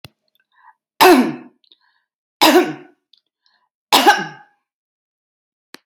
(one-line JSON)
{"cough_length": "5.9 s", "cough_amplitude": 32762, "cough_signal_mean_std_ratio": 0.31, "survey_phase": "alpha (2021-03-01 to 2021-08-12)", "age": "65+", "gender": "Female", "wearing_mask": "No", "symptom_none": true, "smoker_status": "Never smoked", "respiratory_condition_asthma": false, "respiratory_condition_other": false, "recruitment_source": "REACT", "submission_delay": "1 day", "covid_test_result": "Negative", "covid_test_method": "RT-qPCR"}